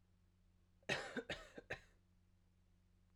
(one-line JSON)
{"three_cough_length": "3.2 s", "three_cough_amplitude": 1902, "three_cough_signal_mean_std_ratio": 0.36, "survey_phase": "alpha (2021-03-01 to 2021-08-12)", "age": "18-44", "gender": "Male", "wearing_mask": "No", "symptom_fatigue": true, "symptom_change_to_sense_of_smell_or_taste": true, "symptom_onset": "6 days", "smoker_status": "Current smoker (e-cigarettes or vapes only)", "respiratory_condition_asthma": false, "respiratory_condition_other": false, "recruitment_source": "Test and Trace", "submission_delay": "1 day", "covid_test_result": "Positive", "covid_test_method": "RT-qPCR", "covid_ct_value": 17.4, "covid_ct_gene": "ORF1ab gene", "covid_ct_mean": 18.4, "covid_viral_load": "940000 copies/ml", "covid_viral_load_category": "Low viral load (10K-1M copies/ml)"}